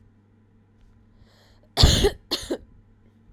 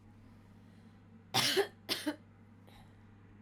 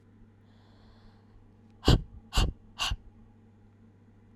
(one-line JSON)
{"cough_length": "3.3 s", "cough_amplitude": 27412, "cough_signal_mean_std_ratio": 0.3, "three_cough_length": "3.4 s", "three_cough_amplitude": 5775, "three_cough_signal_mean_std_ratio": 0.39, "exhalation_length": "4.4 s", "exhalation_amplitude": 15582, "exhalation_signal_mean_std_ratio": 0.29, "survey_phase": "alpha (2021-03-01 to 2021-08-12)", "age": "18-44", "gender": "Female", "wearing_mask": "No", "symptom_cough_any": true, "symptom_abdominal_pain": true, "symptom_fatigue": true, "symptom_fever_high_temperature": true, "symptom_change_to_sense_of_smell_or_taste": true, "symptom_onset": "3 days", "smoker_status": "Never smoked", "respiratory_condition_asthma": false, "respiratory_condition_other": false, "recruitment_source": "Test and Trace", "submission_delay": "2 days", "covid_test_result": "Positive", "covid_test_method": "RT-qPCR", "covid_ct_value": 16.3, "covid_ct_gene": "ORF1ab gene"}